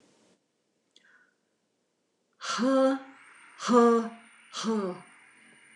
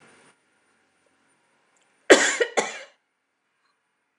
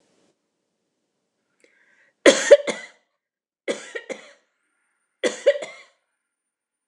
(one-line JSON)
{"exhalation_length": "5.8 s", "exhalation_amplitude": 12618, "exhalation_signal_mean_std_ratio": 0.38, "cough_length": "4.2 s", "cough_amplitude": 29204, "cough_signal_mean_std_ratio": 0.22, "three_cough_length": "6.9 s", "three_cough_amplitude": 29204, "three_cough_signal_mean_std_ratio": 0.21, "survey_phase": "beta (2021-08-13 to 2022-03-07)", "age": "45-64", "gender": "Female", "wearing_mask": "No", "symptom_none": true, "smoker_status": "Ex-smoker", "respiratory_condition_asthma": false, "respiratory_condition_other": false, "recruitment_source": "REACT", "submission_delay": "8 days", "covid_test_result": "Negative", "covid_test_method": "RT-qPCR", "influenza_a_test_result": "Negative", "influenza_b_test_result": "Negative"}